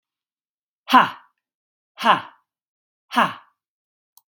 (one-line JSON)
{"exhalation_length": "4.3 s", "exhalation_amplitude": 32767, "exhalation_signal_mean_std_ratio": 0.25, "survey_phase": "beta (2021-08-13 to 2022-03-07)", "age": "45-64", "gender": "Female", "wearing_mask": "No", "symptom_none": true, "smoker_status": "Ex-smoker", "respiratory_condition_asthma": false, "respiratory_condition_other": false, "recruitment_source": "REACT", "submission_delay": "0 days", "covid_test_result": "Negative", "covid_test_method": "RT-qPCR", "influenza_a_test_result": "Negative", "influenza_b_test_result": "Negative"}